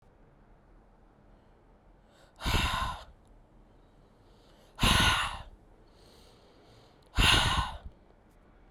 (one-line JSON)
{"exhalation_length": "8.7 s", "exhalation_amplitude": 11962, "exhalation_signal_mean_std_ratio": 0.38, "survey_phase": "beta (2021-08-13 to 2022-03-07)", "age": "18-44", "gender": "Female", "wearing_mask": "No", "symptom_cough_any": true, "symptom_runny_or_blocked_nose": true, "symptom_sore_throat": true, "symptom_headache": true, "symptom_onset": "3 days", "smoker_status": "Never smoked", "respiratory_condition_asthma": false, "respiratory_condition_other": false, "recruitment_source": "Test and Trace", "submission_delay": "1 day", "covid_test_result": "Positive", "covid_test_method": "RT-qPCR", "covid_ct_value": 34.9, "covid_ct_gene": "N gene"}